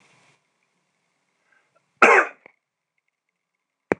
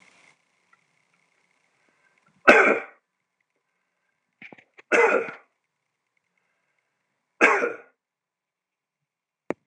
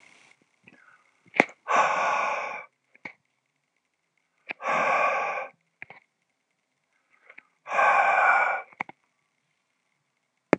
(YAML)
cough_length: 4.0 s
cough_amplitude: 26028
cough_signal_mean_std_ratio: 0.2
three_cough_length: 9.7 s
three_cough_amplitude: 26028
three_cough_signal_mean_std_ratio: 0.24
exhalation_length: 10.6 s
exhalation_amplitude: 26027
exhalation_signal_mean_std_ratio: 0.4
survey_phase: beta (2021-08-13 to 2022-03-07)
age: 45-64
gender: Male
wearing_mask: 'No'
symptom_none: true
smoker_status: Never smoked
respiratory_condition_asthma: false
respiratory_condition_other: false
recruitment_source: REACT
submission_delay: 3 days
covid_test_result: Negative
covid_test_method: RT-qPCR